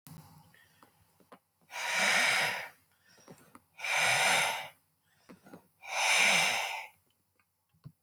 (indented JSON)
{
  "exhalation_length": "8.0 s",
  "exhalation_amplitude": 6594,
  "exhalation_signal_mean_std_ratio": 0.5,
  "survey_phase": "alpha (2021-03-01 to 2021-08-12)",
  "age": "65+",
  "gender": "Male",
  "wearing_mask": "No",
  "symptom_none": true,
  "smoker_status": "Ex-smoker",
  "respiratory_condition_asthma": false,
  "respiratory_condition_other": false,
  "recruitment_source": "REACT",
  "submission_delay": "3 days",
  "covid_test_result": "Negative",
  "covid_test_method": "RT-qPCR"
}